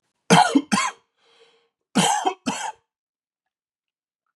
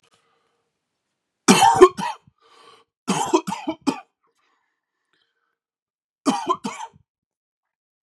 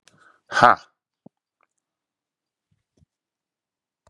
{
  "cough_length": "4.4 s",
  "cough_amplitude": 27531,
  "cough_signal_mean_std_ratio": 0.36,
  "three_cough_length": "8.0 s",
  "three_cough_amplitude": 32768,
  "three_cough_signal_mean_std_ratio": 0.27,
  "exhalation_length": "4.1 s",
  "exhalation_amplitude": 32767,
  "exhalation_signal_mean_std_ratio": 0.15,
  "survey_phase": "beta (2021-08-13 to 2022-03-07)",
  "age": "45-64",
  "gender": "Male",
  "wearing_mask": "No",
  "symptom_runny_or_blocked_nose": true,
  "symptom_headache": true,
  "symptom_change_to_sense_of_smell_or_taste": true,
  "smoker_status": "Ex-smoker",
  "respiratory_condition_asthma": true,
  "respiratory_condition_other": false,
  "recruitment_source": "Test and Trace",
  "submission_delay": "1 day",
  "covid_test_result": "Positive",
  "covid_test_method": "RT-qPCR",
  "covid_ct_value": 19.9,
  "covid_ct_gene": "ORF1ab gene"
}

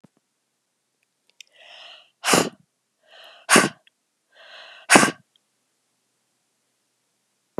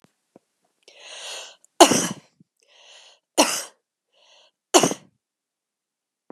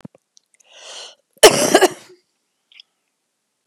{
  "exhalation_length": "7.6 s",
  "exhalation_amplitude": 32768,
  "exhalation_signal_mean_std_ratio": 0.21,
  "three_cough_length": "6.3 s",
  "three_cough_amplitude": 32768,
  "three_cough_signal_mean_std_ratio": 0.23,
  "cough_length": "3.7 s",
  "cough_amplitude": 32768,
  "cough_signal_mean_std_ratio": 0.25,
  "survey_phase": "beta (2021-08-13 to 2022-03-07)",
  "age": "65+",
  "gender": "Female",
  "wearing_mask": "No",
  "symptom_cough_any": true,
  "symptom_runny_or_blocked_nose": true,
  "symptom_other": true,
  "smoker_status": "Never smoked",
  "respiratory_condition_asthma": false,
  "respiratory_condition_other": false,
  "recruitment_source": "Test and Trace",
  "submission_delay": "2 days",
  "covid_test_result": "Positive",
  "covid_test_method": "RT-qPCR",
  "covid_ct_value": 12.2,
  "covid_ct_gene": "ORF1ab gene",
  "covid_ct_mean": 12.7,
  "covid_viral_load": "69000000 copies/ml",
  "covid_viral_load_category": "High viral load (>1M copies/ml)"
}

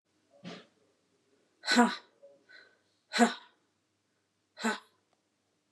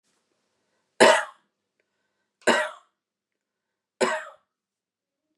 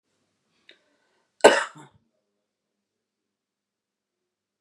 {
  "exhalation_length": "5.7 s",
  "exhalation_amplitude": 12534,
  "exhalation_signal_mean_std_ratio": 0.25,
  "three_cough_length": "5.4 s",
  "three_cough_amplitude": 26282,
  "three_cough_signal_mean_std_ratio": 0.24,
  "cough_length": "4.6 s",
  "cough_amplitude": 32767,
  "cough_signal_mean_std_ratio": 0.14,
  "survey_phase": "beta (2021-08-13 to 2022-03-07)",
  "age": "45-64",
  "gender": "Female",
  "wearing_mask": "No",
  "symptom_sore_throat": true,
  "smoker_status": "Ex-smoker",
  "respiratory_condition_asthma": false,
  "respiratory_condition_other": true,
  "recruitment_source": "REACT",
  "submission_delay": "2 days",
  "covid_test_result": "Negative",
  "covid_test_method": "RT-qPCR",
  "influenza_a_test_result": "Negative",
  "influenza_b_test_result": "Negative"
}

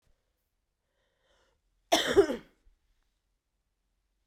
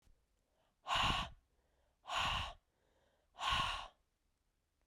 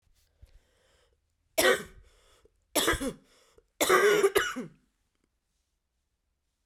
{
  "cough_length": "4.3 s",
  "cough_amplitude": 9982,
  "cough_signal_mean_std_ratio": 0.22,
  "exhalation_length": "4.9 s",
  "exhalation_amplitude": 2262,
  "exhalation_signal_mean_std_ratio": 0.43,
  "three_cough_length": "6.7 s",
  "three_cough_amplitude": 10812,
  "three_cough_signal_mean_std_ratio": 0.35,
  "survey_phase": "beta (2021-08-13 to 2022-03-07)",
  "age": "18-44",
  "gender": "Female",
  "wearing_mask": "No",
  "symptom_cough_any": true,
  "symptom_new_continuous_cough": true,
  "symptom_runny_or_blocked_nose": true,
  "symptom_sore_throat": true,
  "symptom_abdominal_pain": true,
  "symptom_diarrhoea": true,
  "symptom_fatigue": true,
  "symptom_fever_high_temperature": true,
  "symptom_headache": true,
  "symptom_change_to_sense_of_smell_or_taste": true,
  "symptom_loss_of_taste": true,
  "symptom_onset": "4 days",
  "smoker_status": "Ex-smoker",
  "respiratory_condition_asthma": false,
  "respiratory_condition_other": false,
  "recruitment_source": "Test and Trace",
  "submission_delay": "2 days",
  "covid_test_result": "Positive",
  "covid_test_method": "RT-qPCR",
  "covid_ct_value": 15.4,
  "covid_ct_gene": "ORF1ab gene",
  "covid_ct_mean": 15.9,
  "covid_viral_load": "6300000 copies/ml",
  "covid_viral_load_category": "High viral load (>1M copies/ml)"
}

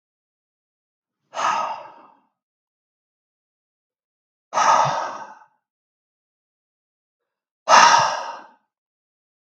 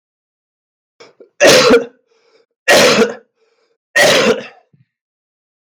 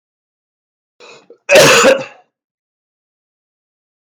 {
  "exhalation_length": "9.5 s",
  "exhalation_amplitude": 32768,
  "exhalation_signal_mean_std_ratio": 0.29,
  "three_cough_length": "5.7 s",
  "three_cough_amplitude": 32768,
  "three_cough_signal_mean_std_ratio": 0.43,
  "cough_length": "4.0 s",
  "cough_amplitude": 32768,
  "cough_signal_mean_std_ratio": 0.32,
  "survey_phase": "beta (2021-08-13 to 2022-03-07)",
  "age": "18-44",
  "gender": "Male",
  "wearing_mask": "No",
  "symptom_cough_any": true,
  "symptom_runny_or_blocked_nose": true,
  "symptom_sore_throat": true,
  "symptom_onset": "2 days",
  "smoker_status": "Never smoked",
  "respiratory_condition_asthma": false,
  "respiratory_condition_other": false,
  "recruitment_source": "Test and Trace",
  "submission_delay": "1 day",
  "covid_test_result": "Positive",
  "covid_test_method": "RT-qPCR",
  "covid_ct_value": 17.5,
  "covid_ct_gene": "ORF1ab gene",
  "covid_ct_mean": 17.7,
  "covid_viral_load": "1500000 copies/ml",
  "covid_viral_load_category": "High viral load (>1M copies/ml)"
}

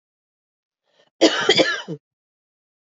{
  "cough_length": "3.0 s",
  "cough_amplitude": 26563,
  "cough_signal_mean_std_ratio": 0.32,
  "survey_phase": "beta (2021-08-13 to 2022-03-07)",
  "age": "45-64",
  "gender": "Female",
  "wearing_mask": "No",
  "symptom_cough_any": true,
  "symptom_runny_or_blocked_nose": true,
  "symptom_sore_throat": true,
  "symptom_diarrhoea": true,
  "symptom_headache": true,
  "symptom_change_to_sense_of_smell_or_taste": true,
  "smoker_status": "Never smoked",
  "respiratory_condition_asthma": false,
  "respiratory_condition_other": false,
  "recruitment_source": "Test and Trace",
  "submission_delay": "1 day",
  "covid_test_result": "Positive",
  "covid_test_method": "ePCR"
}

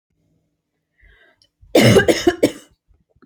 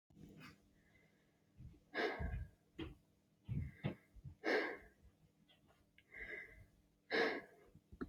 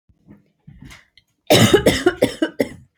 {
  "three_cough_length": "3.3 s",
  "three_cough_amplitude": 29704,
  "three_cough_signal_mean_std_ratio": 0.34,
  "exhalation_length": "8.1 s",
  "exhalation_amplitude": 2027,
  "exhalation_signal_mean_std_ratio": 0.43,
  "cough_length": "3.0 s",
  "cough_amplitude": 32673,
  "cough_signal_mean_std_ratio": 0.4,
  "survey_phase": "alpha (2021-03-01 to 2021-08-12)",
  "age": "18-44",
  "gender": "Female",
  "wearing_mask": "No",
  "symptom_none": true,
  "smoker_status": "Never smoked",
  "respiratory_condition_asthma": false,
  "respiratory_condition_other": false,
  "recruitment_source": "REACT",
  "submission_delay": "3 days",
  "covid_test_result": "Negative",
  "covid_test_method": "RT-qPCR"
}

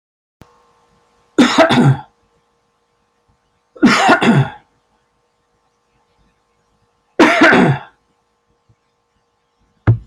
{
  "three_cough_length": "10.1 s",
  "three_cough_amplitude": 30777,
  "three_cough_signal_mean_std_ratio": 0.37,
  "survey_phase": "beta (2021-08-13 to 2022-03-07)",
  "age": "65+",
  "gender": "Male",
  "wearing_mask": "No",
  "symptom_runny_or_blocked_nose": true,
  "smoker_status": "Never smoked",
  "respiratory_condition_asthma": true,
  "respiratory_condition_other": true,
  "recruitment_source": "REACT",
  "submission_delay": "1 day",
  "covid_test_result": "Negative",
  "covid_test_method": "RT-qPCR"
}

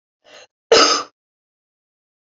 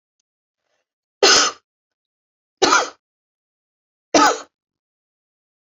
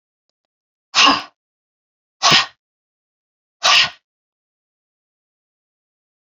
{
  "cough_length": "2.3 s",
  "cough_amplitude": 31363,
  "cough_signal_mean_std_ratio": 0.28,
  "three_cough_length": "5.6 s",
  "three_cough_amplitude": 32346,
  "three_cough_signal_mean_std_ratio": 0.29,
  "exhalation_length": "6.3 s",
  "exhalation_amplitude": 32768,
  "exhalation_signal_mean_std_ratio": 0.27,
  "survey_phase": "beta (2021-08-13 to 2022-03-07)",
  "age": "45-64",
  "gender": "Female",
  "wearing_mask": "No",
  "symptom_headache": true,
  "symptom_loss_of_taste": true,
  "symptom_other": true,
  "symptom_onset": "4 days",
  "smoker_status": "Never smoked",
  "respiratory_condition_asthma": false,
  "respiratory_condition_other": false,
  "recruitment_source": "Test and Trace",
  "submission_delay": "3 days",
  "covid_test_result": "Positive",
  "covid_test_method": "RT-qPCR",
  "covid_ct_value": 13.1,
  "covid_ct_gene": "N gene",
  "covid_ct_mean": 13.6,
  "covid_viral_load": "34000000 copies/ml",
  "covid_viral_load_category": "High viral load (>1M copies/ml)"
}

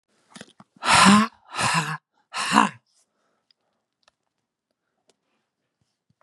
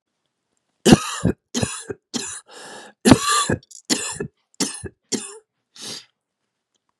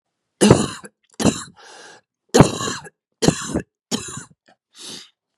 {
  "exhalation_length": "6.2 s",
  "exhalation_amplitude": 30960,
  "exhalation_signal_mean_std_ratio": 0.31,
  "three_cough_length": "7.0 s",
  "three_cough_amplitude": 32768,
  "three_cough_signal_mean_std_ratio": 0.33,
  "cough_length": "5.4 s",
  "cough_amplitude": 32768,
  "cough_signal_mean_std_ratio": 0.33,
  "survey_phase": "beta (2021-08-13 to 2022-03-07)",
  "age": "45-64",
  "gender": "Female",
  "wearing_mask": "No",
  "symptom_cough_any": true,
  "symptom_new_continuous_cough": true,
  "symptom_runny_or_blocked_nose": true,
  "symptom_shortness_of_breath": true,
  "symptom_abdominal_pain": true,
  "symptom_diarrhoea": true,
  "symptom_fatigue": true,
  "symptom_fever_high_temperature": true,
  "symptom_headache": true,
  "symptom_change_to_sense_of_smell_or_taste": true,
  "symptom_loss_of_taste": true,
  "smoker_status": "Current smoker (11 or more cigarettes per day)",
  "respiratory_condition_asthma": false,
  "respiratory_condition_other": false,
  "recruitment_source": "Test and Trace",
  "submission_delay": "3 days",
  "covid_test_result": "Positive",
  "covid_test_method": "LFT"
}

